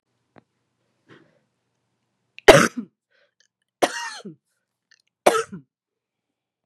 {"three_cough_length": "6.7 s", "three_cough_amplitude": 32768, "three_cough_signal_mean_std_ratio": 0.19, "survey_phase": "beta (2021-08-13 to 2022-03-07)", "age": "45-64", "gender": "Female", "wearing_mask": "No", "symptom_cough_any": true, "symptom_runny_or_blocked_nose": true, "symptom_shortness_of_breath": true, "symptom_sore_throat": true, "symptom_fatigue": true, "symptom_headache": true, "symptom_change_to_sense_of_smell_or_taste": true, "symptom_loss_of_taste": true, "symptom_onset": "2 days", "smoker_status": "Current smoker (1 to 10 cigarettes per day)", "respiratory_condition_asthma": false, "respiratory_condition_other": false, "recruitment_source": "Test and Trace", "submission_delay": "1 day", "covid_test_result": "Positive", "covid_test_method": "RT-qPCR", "covid_ct_value": 19.3, "covid_ct_gene": "ORF1ab gene", "covid_ct_mean": 19.8, "covid_viral_load": "330000 copies/ml", "covid_viral_load_category": "Low viral load (10K-1M copies/ml)"}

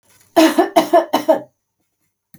{"three_cough_length": "2.4 s", "three_cough_amplitude": 30893, "three_cough_signal_mean_std_ratio": 0.43, "survey_phase": "alpha (2021-03-01 to 2021-08-12)", "age": "45-64", "gender": "Female", "wearing_mask": "No", "symptom_none": true, "smoker_status": "Never smoked", "respiratory_condition_asthma": false, "respiratory_condition_other": false, "recruitment_source": "REACT", "submission_delay": "2 days", "covid_test_result": "Negative", "covid_test_method": "RT-qPCR"}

